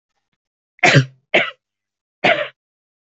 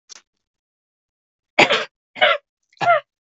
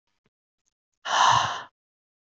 cough_length: 3.2 s
cough_amplitude: 32768
cough_signal_mean_std_ratio: 0.32
three_cough_length: 3.3 s
three_cough_amplitude: 32768
three_cough_signal_mean_std_ratio: 0.32
exhalation_length: 2.3 s
exhalation_amplitude: 14273
exhalation_signal_mean_std_ratio: 0.37
survey_phase: beta (2021-08-13 to 2022-03-07)
age: 18-44
gender: Female
wearing_mask: 'No'
symptom_sore_throat: true
symptom_fatigue: true
smoker_status: Never smoked
respiratory_condition_asthma: true
respiratory_condition_other: false
recruitment_source: Test and Trace
submission_delay: 2 days
covid_test_result: Negative
covid_test_method: RT-qPCR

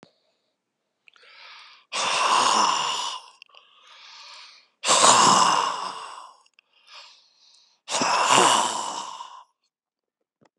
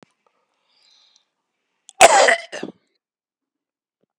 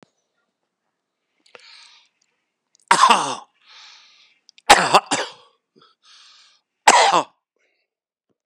exhalation_length: 10.6 s
exhalation_amplitude: 27201
exhalation_signal_mean_std_ratio: 0.47
cough_length: 4.2 s
cough_amplitude: 32768
cough_signal_mean_std_ratio: 0.23
three_cough_length: 8.5 s
three_cough_amplitude: 32768
three_cough_signal_mean_std_ratio: 0.27
survey_phase: beta (2021-08-13 to 2022-03-07)
age: 45-64
gender: Male
wearing_mask: 'No'
symptom_cough_any: true
symptom_new_continuous_cough: true
symptom_runny_or_blocked_nose: true
symptom_shortness_of_breath: true
symptom_sore_throat: true
symptom_change_to_sense_of_smell_or_taste: true
symptom_onset: 4 days
smoker_status: Ex-smoker
respiratory_condition_asthma: false
respiratory_condition_other: true
recruitment_source: Test and Trace
submission_delay: 1 day
covid_test_result: Positive
covid_test_method: RT-qPCR
covid_ct_value: 17.5
covid_ct_gene: ORF1ab gene
covid_ct_mean: 17.9
covid_viral_load: 1400000 copies/ml
covid_viral_load_category: High viral load (>1M copies/ml)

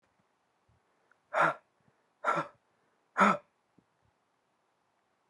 exhalation_length: 5.3 s
exhalation_amplitude: 8348
exhalation_signal_mean_std_ratio: 0.26
survey_phase: beta (2021-08-13 to 2022-03-07)
age: 18-44
gender: Female
wearing_mask: 'No'
symptom_cough_any: true
symptom_sore_throat: true
symptom_fatigue: true
symptom_onset: 3 days
smoker_status: Never smoked
respiratory_condition_asthma: false
respiratory_condition_other: false
recruitment_source: Test and Trace
submission_delay: 2 days
covid_test_result: Positive
covid_test_method: RT-qPCR
covid_ct_value: 28.9
covid_ct_gene: N gene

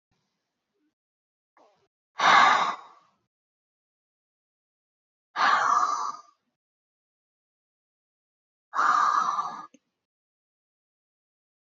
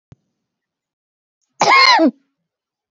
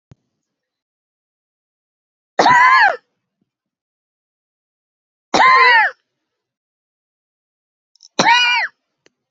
exhalation_length: 11.8 s
exhalation_amplitude: 16044
exhalation_signal_mean_std_ratio: 0.33
cough_length: 2.9 s
cough_amplitude: 32039
cough_signal_mean_std_ratio: 0.35
three_cough_length: 9.3 s
three_cough_amplitude: 30917
three_cough_signal_mean_std_ratio: 0.34
survey_phase: beta (2021-08-13 to 2022-03-07)
age: 18-44
gender: Female
wearing_mask: 'No'
symptom_cough_any: true
symptom_runny_or_blocked_nose: true
symptom_diarrhoea: true
symptom_fatigue: true
symptom_headache: true
symptom_onset: 0 days
smoker_status: Never smoked
respiratory_condition_asthma: true
respiratory_condition_other: false
recruitment_source: Test and Trace
submission_delay: 0 days
covid_test_result: Positive
covid_test_method: RT-qPCR
covid_ct_value: 24.5
covid_ct_gene: N gene
covid_ct_mean: 24.8
covid_viral_load: 7200 copies/ml
covid_viral_load_category: Minimal viral load (< 10K copies/ml)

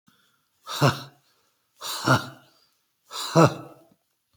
exhalation_length: 4.4 s
exhalation_amplitude: 26493
exhalation_signal_mean_std_ratio: 0.31
survey_phase: beta (2021-08-13 to 2022-03-07)
age: 45-64
gender: Male
wearing_mask: 'No'
symptom_none: true
smoker_status: Never smoked
respiratory_condition_asthma: false
respiratory_condition_other: false
recruitment_source: REACT
submission_delay: 8 days
covid_test_result: Negative
covid_test_method: RT-qPCR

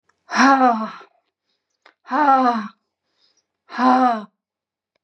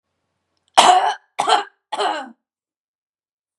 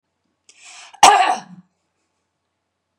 exhalation_length: 5.0 s
exhalation_amplitude: 27858
exhalation_signal_mean_std_ratio: 0.45
three_cough_length: 3.6 s
three_cough_amplitude: 32768
three_cough_signal_mean_std_ratio: 0.36
cough_length: 3.0 s
cough_amplitude: 32768
cough_signal_mean_std_ratio: 0.26
survey_phase: beta (2021-08-13 to 2022-03-07)
age: 45-64
gender: Female
wearing_mask: 'No'
symptom_headache: true
smoker_status: Never smoked
respiratory_condition_asthma: false
respiratory_condition_other: false
recruitment_source: REACT
submission_delay: 3 days
covid_test_result: Negative
covid_test_method: RT-qPCR
influenza_a_test_result: Negative
influenza_b_test_result: Negative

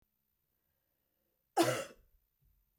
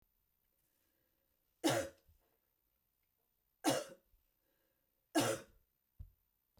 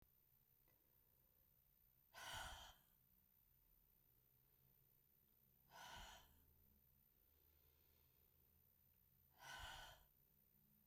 cough_length: 2.8 s
cough_amplitude: 5502
cough_signal_mean_std_ratio: 0.24
three_cough_length: 6.6 s
three_cough_amplitude: 3187
three_cough_signal_mean_std_ratio: 0.26
exhalation_length: 10.9 s
exhalation_amplitude: 266
exhalation_signal_mean_std_ratio: 0.5
survey_phase: beta (2021-08-13 to 2022-03-07)
age: 45-64
gender: Female
wearing_mask: 'No'
symptom_none: true
smoker_status: Never smoked
respiratory_condition_asthma: false
respiratory_condition_other: false
recruitment_source: REACT
submission_delay: 2 days
covid_test_result: Negative
covid_test_method: RT-qPCR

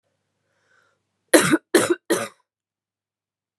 three_cough_length: 3.6 s
three_cough_amplitude: 32619
three_cough_signal_mean_std_ratio: 0.29
survey_phase: beta (2021-08-13 to 2022-03-07)
age: 18-44
gender: Female
wearing_mask: 'No'
symptom_cough_any: true
symptom_runny_or_blocked_nose: true
symptom_shortness_of_breath: true
symptom_sore_throat: true
symptom_abdominal_pain: true
symptom_fatigue: true
symptom_headache: true
symptom_change_to_sense_of_smell_or_taste: true
symptom_loss_of_taste: true
symptom_onset: 4 days
smoker_status: Current smoker (1 to 10 cigarettes per day)
respiratory_condition_asthma: true
respiratory_condition_other: false
recruitment_source: Test and Trace
submission_delay: 2 days
covid_test_result: Positive
covid_test_method: RT-qPCR
covid_ct_value: 16.8
covid_ct_gene: N gene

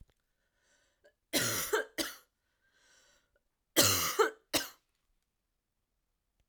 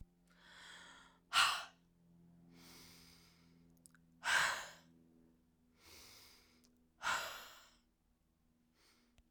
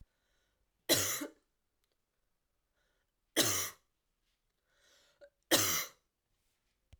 cough_length: 6.5 s
cough_amplitude: 8683
cough_signal_mean_std_ratio: 0.33
exhalation_length: 9.3 s
exhalation_amplitude: 4675
exhalation_signal_mean_std_ratio: 0.31
three_cough_length: 7.0 s
three_cough_amplitude: 8348
three_cough_signal_mean_std_ratio: 0.29
survey_phase: alpha (2021-03-01 to 2021-08-12)
age: 18-44
gender: Female
wearing_mask: 'No'
symptom_cough_any: true
symptom_change_to_sense_of_smell_or_taste: true
symptom_onset: 4 days
smoker_status: Ex-smoker
respiratory_condition_asthma: false
respiratory_condition_other: false
recruitment_source: Test and Trace
submission_delay: 2 days
covid_test_result: Positive
covid_test_method: RT-qPCR
covid_ct_value: 16.4
covid_ct_gene: ORF1ab gene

